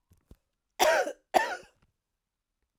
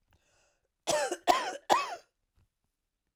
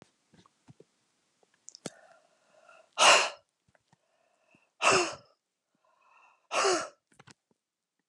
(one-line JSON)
{"cough_length": "2.8 s", "cough_amplitude": 13999, "cough_signal_mean_std_ratio": 0.32, "three_cough_length": "3.2 s", "three_cough_amplitude": 12962, "three_cough_signal_mean_std_ratio": 0.36, "exhalation_length": "8.1 s", "exhalation_amplitude": 15106, "exhalation_signal_mean_std_ratio": 0.26, "survey_phase": "alpha (2021-03-01 to 2021-08-12)", "age": "45-64", "gender": "Female", "wearing_mask": "No", "symptom_none": true, "smoker_status": "Never smoked", "respiratory_condition_asthma": false, "respiratory_condition_other": false, "recruitment_source": "REACT", "submission_delay": "3 days", "covid_test_result": "Negative", "covid_test_method": "RT-qPCR"}